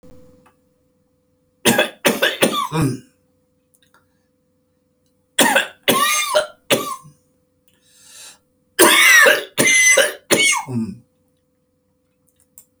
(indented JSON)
{
  "three_cough_length": "12.8 s",
  "three_cough_amplitude": 32768,
  "three_cough_signal_mean_std_ratio": 0.43,
  "survey_phase": "beta (2021-08-13 to 2022-03-07)",
  "age": "65+",
  "gender": "Male",
  "wearing_mask": "No",
  "symptom_none": true,
  "smoker_status": "Never smoked",
  "respiratory_condition_asthma": false,
  "respiratory_condition_other": false,
  "recruitment_source": "REACT",
  "submission_delay": "2 days",
  "covid_test_result": "Negative",
  "covid_test_method": "RT-qPCR"
}